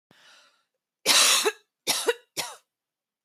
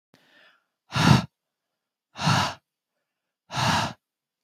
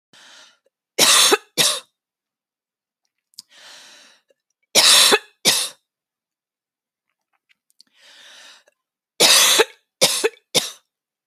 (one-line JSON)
{"cough_length": "3.2 s", "cough_amplitude": 20004, "cough_signal_mean_std_ratio": 0.38, "exhalation_length": "4.4 s", "exhalation_amplitude": 22113, "exhalation_signal_mean_std_ratio": 0.35, "three_cough_length": "11.3 s", "three_cough_amplitude": 32768, "three_cough_signal_mean_std_ratio": 0.34, "survey_phase": "beta (2021-08-13 to 2022-03-07)", "age": "18-44", "gender": "Female", "wearing_mask": "No", "symptom_none": true, "smoker_status": "Never smoked", "respiratory_condition_asthma": false, "respiratory_condition_other": false, "recruitment_source": "REACT", "submission_delay": "0 days", "covid_test_result": "Negative", "covid_test_method": "RT-qPCR"}